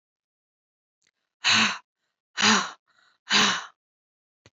{"exhalation_length": "4.5 s", "exhalation_amplitude": 15033, "exhalation_signal_mean_std_ratio": 0.36, "survey_phase": "beta (2021-08-13 to 2022-03-07)", "age": "45-64", "gender": "Female", "wearing_mask": "No", "symptom_none": true, "smoker_status": "Never smoked", "respiratory_condition_asthma": false, "respiratory_condition_other": false, "recruitment_source": "REACT", "submission_delay": "2 days", "covid_test_result": "Negative", "covid_test_method": "RT-qPCR", "influenza_a_test_result": "Negative", "influenza_b_test_result": "Negative"}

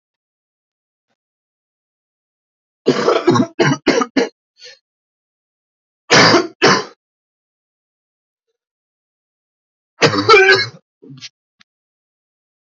{"three_cough_length": "12.7 s", "three_cough_amplitude": 32768, "three_cough_signal_mean_std_ratio": 0.33, "survey_phase": "alpha (2021-03-01 to 2021-08-12)", "age": "18-44", "gender": "Male", "wearing_mask": "No", "symptom_cough_any": true, "symptom_headache": true, "symptom_onset": "2 days", "smoker_status": "Ex-smoker", "recruitment_source": "Test and Trace", "submission_delay": "1 day", "covid_test_result": "Positive", "covid_test_method": "RT-qPCR", "covid_ct_value": 15.2, "covid_ct_gene": "ORF1ab gene", "covid_ct_mean": 15.2, "covid_viral_load": "10000000 copies/ml", "covid_viral_load_category": "High viral load (>1M copies/ml)"}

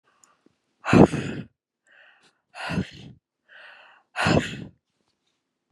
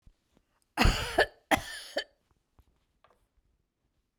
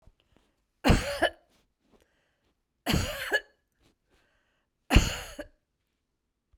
{"exhalation_length": "5.7 s", "exhalation_amplitude": 32546, "exhalation_signal_mean_std_ratio": 0.28, "cough_length": "4.2 s", "cough_amplitude": 10624, "cough_signal_mean_std_ratio": 0.28, "three_cough_length": "6.6 s", "three_cough_amplitude": 18872, "three_cough_signal_mean_std_ratio": 0.29, "survey_phase": "beta (2021-08-13 to 2022-03-07)", "age": "65+", "gender": "Female", "wearing_mask": "No", "symptom_none": true, "smoker_status": "Never smoked", "respiratory_condition_asthma": false, "respiratory_condition_other": false, "recruitment_source": "REACT", "submission_delay": "3 days", "covid_test_result": "Negative", "covid_test_method": "RT-qPCR"}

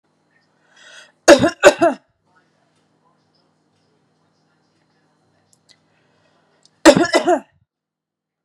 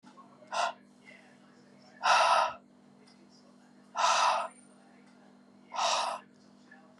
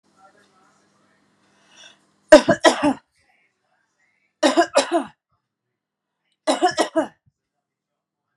{"cough_length": "8.4 s", "cough_amplitude": 32768, "cough_signal_mean_std_ratio": 0.23, "exhalation_length": "7.0 s", "exhalation_amplitude": 7431, "exhalation_signal_mean_std_ratio": 0.43, "three_cough_length": "8.4 s", "three_cough_amplitude": 32768, "three_cough_signal_mean_std_ratio": 0.26, "survey_phase": "beta (2021-08-13 to 2022-03-07)", "age": "45-64", "gender": "Female", "wearing_mask": "No", "symptom_new_continuous_cough": true, "symptom_runny_or_blocked_nose": true, "symptom_fatigue": true, "symptom_fever_high_temperature": true, "symptom_headache": true, "symptom_change_to_sense_of_smell_or_taste": true, "symptom_onset": "3 days", "smoker_status": "Ex-smoker", "respiratory_condition_asthma": false, "respiratory_condition_other": false, "recruitment_source": "Test and Trace", "submission_delay": "2 days", "covid_test_result": "Positive", "covid_test_method": "RT-qPCR", "covid_ct_value": 17.0, "covid_ct_gene": "S gene", "covid_ct_mean": 17.4, "covid_viral_load": "2000000 copies/ml", "covid_viral_load_category": "High viral load (>1M copies/ml)"}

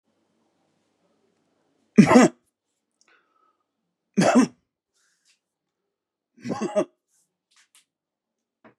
{"three_cough_length": "8.8 s", "three_cough_amplitude": 30591, "three_cough_signal_mean_std_ratio": 0.22, "survey_phase": "beta (2021-08-13 to 2022-03-07)", "age": "45-64", "gender": "Male", "wearing_mask": "No", "symptom_none": true, "smoker_status": "Never smoked", "respiratory_condition_asthma": false, "respiratory_condition_other": false, "recruitment_source": "REACT", "submission_delay": "2 days", "covid_test_result": "Negative", "covid_test_method": "RT-qPCR", "influenza_a_test_result": "Negative", "influenza_b_test_result": "Negative"}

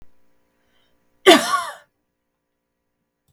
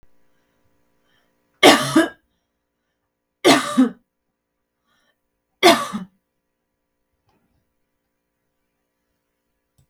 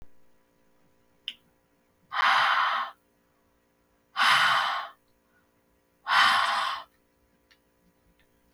{"cough_length": "3.3 s", "cough_amplitude": 32768, "cough_signal_mean_std_ratio": 0.23, "three_cough_length": "9.9 s", "three_cough_amplitude": 32768, "three_cough_signal_mean_std_ratio": 0.24, "exhalation_length": "8.5 s", "exhalation_amplitude": 11634, "exhalation_signal_mean_std_ratio": 0.42, "survey_phase": "beta (2021-08-13 to 2022-03-07)", "age": "18-44", "gender": "Female", "wearing_mask": "No", "symptom_none": true, "smoker_status": "Ex-smoker", "respiratory_condition_asthma": false, "respiratory_condition_other": false, "recruitment_source": "REACT", "submission_delay": "5 days", "covid_test_result": "Negative", "covid_test_method": "RT-qPCR"}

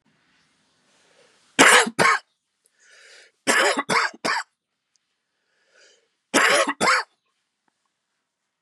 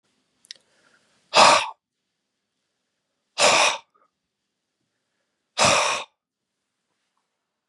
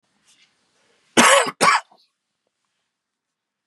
{"three_cough_length": "8.6 s", "three_cough_amplitude": 32578, "three_cough_signal_mean_std_ratio": 0.35, "exhalation_length": "7.7 s", "exhalation_amplitude": 30817, "exhalation_signal_mean_std_ratio": 0.29, "cough_length": "3.7 s", "cough_amplitude": 32747, "cough_signal_mean_std_ratio": 0.29, "survey_phase": "beta (2021-08-13 to 2022-03-07)", "age": "45-64", "gender": "Male", "wearing_mask": "No", "symptom_cough_any": true, "symptom_runny_or_blocked_nose": true, "symptom_onset": "2 days", "smoker_status": "Never smoked", "respiratory_condition_asthma": false, "respiratory_condition_other": false, "recruitment_source": "REACT", "submission_delay": "2 days", "covid_test_result": "Negative", "covid_test_method": "RT-qPCR", "influenza_a_test_result": "Negative", "influenza_b_test_result": "Negative"}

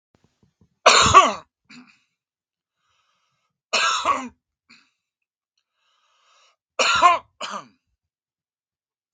{"three_cough_length": "9.1 s", "three_cough_amplitude": 32768, "three_cough_signal_mean_std_ratio": 0.29, "survey_phase": "beta (2021-08-13 to 2022-03-07)", "age": "45-64", "gender": "Male", "wearing_mask": "No", "symptom_none": true, "smoker_status": "Never smoked", "respiratory_condition_asthma": false, "respiratory_condition_other": false, "recruitment_source": "REACT", "submission_delay": "2 days", "covid_test_result": "Negative", "covid_test_method": "RT-qPCR", "influenza_a_test_result": "Negative", "influenza_b_test_result": "Negative"}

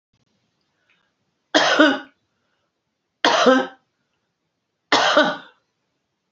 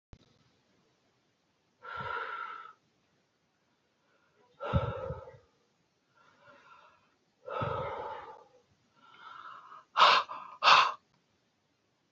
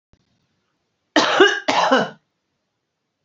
{"three_cough_length": "6.3 s", "three_cough_amplitude": 32767, "three_cough_signal_mean_std_ratio": 0.36, "exhalation_length": "12.1 s", "exhalation_amplitude": 13386, "exhalation_signal_mean_std_ratio": 0.29, "cough_length": "3.2 s", "cough_amplitude": 32767, "cough_signal_mean_std_ratio": 0.39, "survey_phase": "beta (2021-08-13 to 2022-03-07)", "age": "65+", "gender": "Female", "wearing_mask": "No", "symptom_none": true, "smoker_status": "Ex-smoker", "respiratory_condition_asthma": false, "respiratory_condition_other": false, "recruitment_source": "REACT", "submission_delay": "2 days", "covid_test_result": "Negative", "covid_test_method": "RT-qPCR", "influenza_a_test_result": "Negative", "influenza_b_test_result": "Negative"}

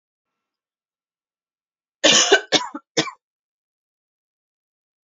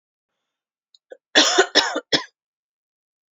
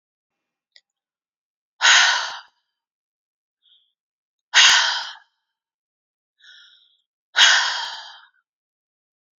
{"three_cough_length": "5.0 s", "three_cough_amplitude": 29439, "three_cough_signal_mean_std_ratio": 0.25, "cough_length": "3.3 s", "cough_amplitude": 28502, "cough_signal_mean_std_ratio": 0.31, "exhalation_length": "9.4 s", "exhalation_amplitude": 32053, "exhalation_signal_mean_std_ratio": 0.3, "survey_phase": "alpha (2021-03-01 to 2021-08-12)", "age": "18-44", "gender": "Female", "wearing_mask": "No", "symptom_fatigue": true, "symptom_onset": "12 days", "smoker_status": "Never smoked", "respiratory_condition_asthma": false, "respiratory_condition_other": false, "recruitment_source": "REACT", "submission_delay": "1 day", "covid_test_result": "Negative", "covid_test_method": "RT-qPCR"}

